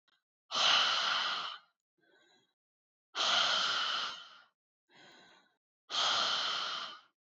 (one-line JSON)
{"exhalation_length": "7.3 s", "exhalation_amplitude": 6515, "exhalation_signal_mean_std_ratio": 0.56, "survey_phase": "alpha (2021-03-01 to 2021-08-12)", "age": "18-44", "gender": "Female", "wearing_mask": "No", "symptom_none": true, "smoker_status": "Never smoked", "respiratory_condition_asthma": false, "respiratory_condition_other": false, "recruitment_source": "REACT", "submission_delay": "1 day", "covid_test_result": "Negative", "covid_test_method": "RT-qPCR"}